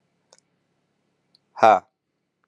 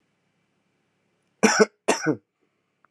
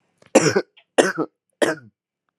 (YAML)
exhalation_length: 2.5 s
exhalation_amplitude: 30447
exhalation_signal_mean_std_ratio: 0.2
cough_length: 2.9 s
cough_amplitude: 26760
cough_signal_mean_std_ratio: 0.28
three_cough_length: 2.4 s
three_cough_amplitude: 32767
three_cough_signal_mean_std_ratio: 0.35
survey_phase: alpha (2021-03-01 to 2021-08-12)
age: 18-44
gender: Male
wearing_mask: 'No'
symptom_none: true
smoker_status: Current smoker (1 to 10 cigarettes per day)
respiratory_condition_asthma: false
respiratory_condition_other: false
recruitment_source: Test and Trace
submission_delay: 1 day
covid_test_result: Positive
covid_test_method: LFT